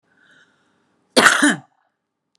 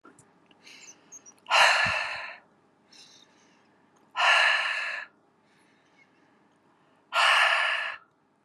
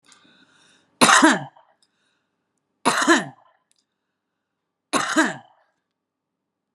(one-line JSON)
{"cough_length": "2.4 s", "cough_amplitude": 32768, "cough_signal_mean_std_ratio": 0.31, "exhalation_length": "8.4 s", "exhalation_amplitude": 17307, "exhalation_signal_mean_std_ratio": 0.43, "three_cough_length": "6.7 s", "three_cough_amplitude": 30807, "three_cough_signal_mean_std_ratio": 0.31, "survey_phase": "beta (2021-08-13 to 2022-03-07)", "age": "45-64", "gender": "Female", "wearing_mask": "No", "symptom_none": true, "symptom_onset": "7 days", "smoker_status": "Current smoker (11 or more cigarettes per day)", "respiratory_condition_asthma": false, "respiratory_condition_other": false, "recruitment_source": "REACT", "submission_delay": "2 days", "covid_test_result": "Negative", "covid_test_method": "RT-qPCR", "influenza_a_test_result": "Negative", "influenza_b_test_result": "Negative"}